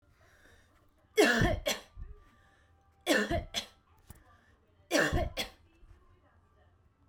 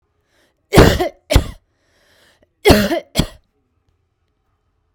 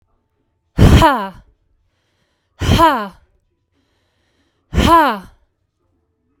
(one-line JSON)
{"three_cough_length": "7.1 s", "three_cough_amplitude": 8585, "three_cough_signal_mean_std_ratio": 0.38, "cough_length": "4.9 s", "cough_amplitude": 32768, "cough_signal_mean_std_ratio": 0.31, "exhalation_length": "6.4 s", "exhalation_amplitude": 32768, "exhalation_signal_mean_std_ratio": 0.37, "survey_phase": "beta (2021-08-13 to 2022-03-07)", "age": "45-64", "gender": "Female", "wearing_mask": "No", "symptom_runny_or_blocked_nose": true, "symptom_abdominal_pain": true, "symptom_headache": true, "smoker_status": "Never smoked", "respiratory_condition_asthma": true, "respiratory_condition_other": false, "recruitment_source": "Test and Trace", "submission_delay": "1 day", "covid_test_result": "Positive", "covid_test_method": "RT-qPCR", "covid_ct_value": 24.6, "covid_ct_gene": "ORF1ab gene"}